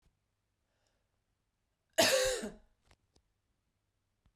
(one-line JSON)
{"cough_length": "4.4 s", "cough_amplitude": 7026, "cough_signal_mean_std_ratio": 0.26, "survey_phase": "beta (2021-08-13 to 2022-03-07)", "age": "45-64", "gender": "Female", "wearing_mask": "No", "symptom_cough_any": true, "symptom_runny_or_blocked_nose": true, "symptom_sore_throat": true, "symptom_headache": true, "symptom_change_to_sense_of_smell_or_taste": true, "symptom_onset": "4 days", "smoker_status": "Never smoked", "respiratory_condition_asthma": false, "respiratory_condition_other": false, "recruitment_source": "Test and Trace", "submission_delay": "1 day", "covid_test_result": "Positive", "covid_test_method": "RT-qPCR", "covid_ct_value": 20.7, "covid_ct_gene": "ORF1ab gene", "covid_ct_mean": 21.3, "covid_viral_load": "100000 copies/ml", "covid_viral_load_category": "Low viral load (10K-1M copies/ml)"}